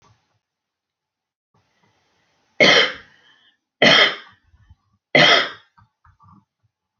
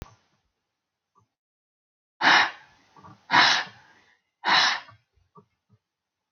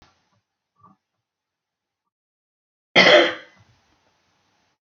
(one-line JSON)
{"three_cough_length": "7.0 s", "three_cough_amplitude": 32241, "three_cough_signal_mean_std_ratio": 0.3, "exhalation_length": "6.3 s", "exhalation_amplitude": 20666, "exhalation_signal_mean_std_ratio": 0.31, "cough_length": "4.9 s", "cough_amplitude": 28385, "cough_signal_mean_std_ratio": 0.21, "survey_phase": "beta (2021-08-13 to 2022-03-07)", "age": "45-64", "gender": "Female", "wearing_mask": "No", "symptom_none": true, "smoker_status": "Current smoker (11 or more cigarettes per day)", "respiratory_condition_asthma": false, "respiratory_condition_other": false, "recruitment_source": "REACT", "submission_delay": "1 day", "covid_test_result": "Negative", "covid_test_method": "RT-qPCR"}